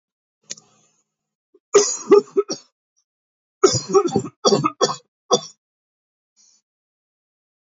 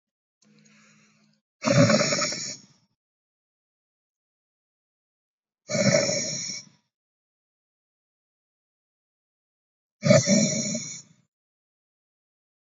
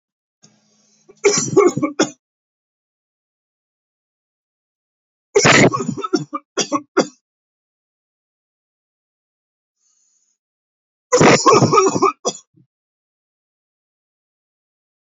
{
  "cough_length": "7.8 s",
  "cough_amplitude": 27193,
  "cough_signal_mean_std_ratio": 0.3,
  "exhalation_length": "12.6 s",
  "exhalation_amplitude": 20628,
  "exhalation_signal_mean_std_ratio": 0.32,
  "three_cough_length": "15.0 s",
  "three_cough_amplitude": 31525,
  "three_cough_signal_mean_std_ratio": 0.32,
  "survey_phase": "beta (2021-08-13 to 2022-03-07)",
  "age": "18-44",
  "gender": "Male",
  "wearing_mask": "No",
  "symptom_runny_or_blocked_nose": true,
  "symptom_onset": "5 days",
  "smoker_status": "Current smoker (e-cigarettes or vapes only)",
  "respiratory_condition_asthma": false,
  "respiratory_condition_other": false,
  "recruitment_source": "Test and Trace",
  "submission_delay": "1 day",
  "covid_test_result": "Positive",
  "covid_test_method": "ePCR"
}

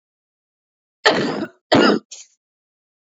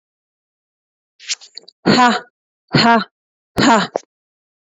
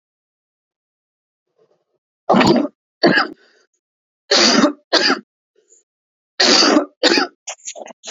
{
  "cough_length": "3.2 s",
  "cough_amplitude": 27742,
  "cough_signal_mean_std_ratio": 0.36,
  "exhalation_length": "4.6 s",
  "exhalation_amplitude": 29358,
  "exhalation_signal_mean_std_ratio": 0.38,
  "three_cough_length": "8.1 s",
  "three_cough_amplitude": 32768,
  "three_cough_signal_mean_std_ratio": 0.41,
  "survey_phase": "beta (2021-08-13 to 2022-03-07)",
  "age": "18-44",
  "gender": "Female",
  "wearing_mask": "No",
  "symptom_none": true,
  "smoker_status": "Ex-smoker",
  "respiratory_condition_asthma": false,
  "respiratory_condition_other": false,
  "recruitment_source": "REACT",
  "submission_delay": "3 days",
  "covid_test_result": "Negative",
  "covid_test_method": "RT-qPCR",
  "influenza_a_test_result": "Negative",
  "influenza_b_test_result": "Negative"
}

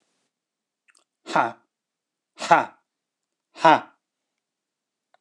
{
  "exhalation_length": "5.2 s",
  "exhalation_amplitude": 26027,
  "exhalation_signal_mean_std_ratio": 0.22,
  "survey_phase": "beta (2021-08-13 to 2022-03-07)",
  "age": "45-64",
  "gender": "Male",
  "wearing_mask": "No",
  "symptom_none": true,
  "smoker_status": "Never smoked",
  "respiratory_condition_asthma": false,
  "respiratory_condition_other": false,
  "recruitment_source": "REACT",
  "submission_delay": "1 day",
  "covid_test_result": "Negative",
  "covid_test_method": "RT-qPCR",
  "influenza_a_test_result": "Negative",
  "influenza_b_test_result": "Negative"
}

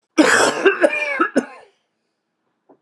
{
  "cough_length": "2.8 s",
  "cough_amplitude": 30900,
  "cough_signal_mean_std_ratio": 0.49,
  "survey_phase": "beta (2021-08-13 to 2022-03-07)",
  "age": "65+",
  "gender": "Male",
  "wearing_mask": "No",
  "symptom_cough_any": true,
  "symptom_fatigue": true,
  "symptom_headache": true,
  "symptom_onset": "5 days",
  "smoker_status": "Ex-smoker",
  "respiratory_condition_asthma": true,
  "respiratory_condition_other": false,
  "recruitment_source": "Test and Trace",
  "submission_delay": "2 days",
  "covid_test_result": "Positive",
  "covid_test_method": "RT-qPCR",
  "covid_ct_value": 14.5,
  "covid_ct_gene": "ORF1ab gene",
  "covid_ct_mean": 15.0,
  "covid_viral_load": "12000000 copies/ml",
  "covid_viral_load_category": "High viral load (>1M copies/ml)"
}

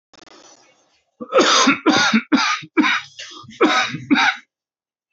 {
  "cough_length": "5.1 s",
  "cough_amplitude": 26322,
  "cough_signal_mean_std_ratio": 0.54,
  "survey_phase": "alpha (2021-03-01 to 2021-08-12)",
  "age": "45-64",
  "gender": "Male",
  "wearing_mask": "No",
  "symptom_cough_any": true,
  "symptom_shortness_of_breath": true,
  "symptom_fatigue": true,
  "symptom_onset": "12 days",
  "smoker_status": "Never smoked",
  "respiratory_condition_asthma": false,
  "respiratory_condition_other": false,
  "recruitment_source": "REACT",
  "submission_delay": "1 day",
  "covid_test_result": "Negative",
  "covid_test_method": "RT-qPCR"
}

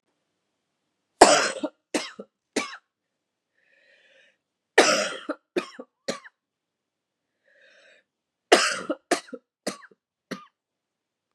{
  "three_cough_length": "11.3 s",
  "three_cough_amplitude": 32768,
  "three_cough_signal_mean_std_ratio": 0.25,
  "survey_phase": "beta (2021-08-13 to 2022-03-07)",
  "age": "45-64",
  "gender": "Female",
  "wearing_mask": "No",
  "symptom_cough_any": true,
  "symptom_runny_or_blocked_nose": true,
  "symptom_onset": "12 days",
  "smoker_status": "Never smoked",
  "respiratory_condition_asthma": false,
  "respiratory_condition_other": false,
  "recruitment_source": "REACT",
  "submission_delay": "2 days",
  "covid_test_result": "Negative",
  "covid_test_method": "RT-qPCR",
  "influenza_a_test_result": "Negative",
  "influenza_b_test_result": "Negative"
}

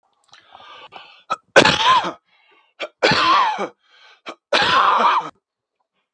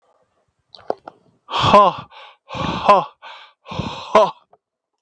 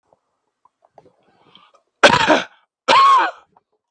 {
  "three_cough_length": "6.1 s",
  "three_cough_amplitude": 32768,
  "three_cough_signal_mean_std_ratio": 0.47,
  "exhalation_length": "5.0 s",
  "exhalation_amplitude": 32768,
  "exhalation_signal_mean_std_ratio": 0.36,
  "cough_length": "3.9 s",
  "cough_amplitude": 32768,
  "cough_signal_mean_std_ratio": 0.37,
  "survey_phase": "beta (2021-08-13 to 2022-03-07)",
  "age": "45-64",
  "gender": "Male",
  "wearing_mask": "Yes",
  "symptom_none": true,
  "smoker_status": "Ex-smoker",
  "respiratory_condition_asthma": false,
  "respiratory_condition_other": false,
  "recruitment_source": "REACT",
  "submission_delay": "2 days",
  "covid_test_result": "Negative",
  "covid_test_method": "RT-qPCR",
  "influenza_a_test_result": "Negative",
  "influenza_b_test_result": "Negative"
}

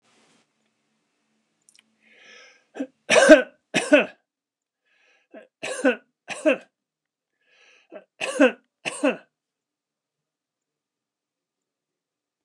{
  "three_cough_length": "12.4 s",
  "three_cough_amplitude": 29204,
  "three_cough_signal_mean_std_ratio": 0.23,
  "survey_phase": "alpha (2021-03-01 to 2021-08-12)",
  "age": "65+",
  "gender": "Male",
  "wearing_mask": "No",
  "symptom_none": true,
  "smoker_status": "Ex-smoker",
  "respiratory_condition_asthma": false,
  "respiratory_condition_other": false,
  "recruitment_source": "REACT",
  "submission_delay": "1 day",
  "covid_test_result": "Negative",
  "covid_test_method": "RT-qPCR"
}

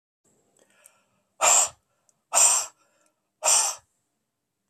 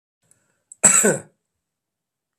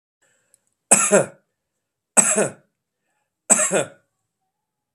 {
  "exhalation_length": "4.7 s",
  "exhalation_amplitude": 17432,
  "exhalation_signal_mean_std_ratio": 0.35,
  "cough_length": "2.4 s",
  "cough_amplitude": 32768,
  "cough_signal_mean_std_ratio": 0.29,
  "three_cough_length": "4.9 s",
  "three_cough_amplitude": 32768,
  "three_cough_signal_mean_std_ratio": 0.32,
  "survey_phase": "beta (2021-08-13 to 2022-03-07)",
  "age": "45-64",
  "gender": "Male",
  "wearing_mask": "No",
  "symptom_none": true,
  "smoker_status": "Never smoked",
  "respiratory_condition_asthma": false,
  "respiratory_condition_other": false,
  "recruitment_source": "REACT",
  "submission_delay": "1 day",
  "covid_test_result": "Negative",
  "covid_test_method": "RT-qPCR",
  "influenza_a_test_result": "Negative",
  "influenza_b_test_result": "Negative"
}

